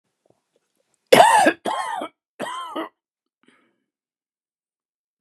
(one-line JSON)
{"three_cough_length": "5.2 s", "three_cough_amplitude": 32768, "three_cough_signal_mean_std_ratio": 0.29, "survey_phase": "beta (2021-08-13 to 2022-03-07)", "age": "65+", "gender": "Male", "wearing_mask": "No", "symptom_cough_any": true, "smoker_status": "Never smoked", "respiratory_condition_asthma": false, "respiratory_condition_other": false, "recruitment_source": "REACT", "submission_delay": "2 days", "covid_test_result": "Negative", "covid_test_method": "RT-qPCR", "influenza_a_test_result": "Negative", "influenza_b_test_result": "Negative"}